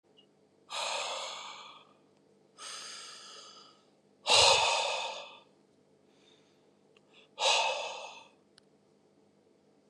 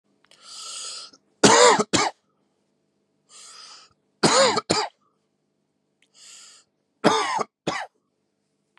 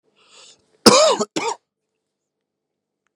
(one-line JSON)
{"exhalation_length": "9.9 s", "exhalation_amplitude": 9796, "exhalation_signal_mean_std_ratio": 0.37, "three_cough_length": "8.8 s", "three_cough_amplitude": 31929, "three_cough_signal_mean_std_ratio": 0.34, "cough_length": "3.2 s", "cough_amplitude": 32768, "cough_signal_mean_std_ratio": 0.29, "survey_phase": "beta (2021-08-13 to 2022-03-07)", "age": "18-44", "gender": "Male", "wearing_mask": "No", "symptom_none": true, "symptom_onset": "7 days", "smoker_status": "Never smoked", "respiratory_condition_asthma": false, "respiratory_condition_other": false, "recruitment_source": "REACT", "submission_delay": "2 days", "covid_test_result": "Negative", "covid_test_method": "RT-qPCR", "influenza_a_test_result": "Negative", "influenza_b_test_result": "Negative"}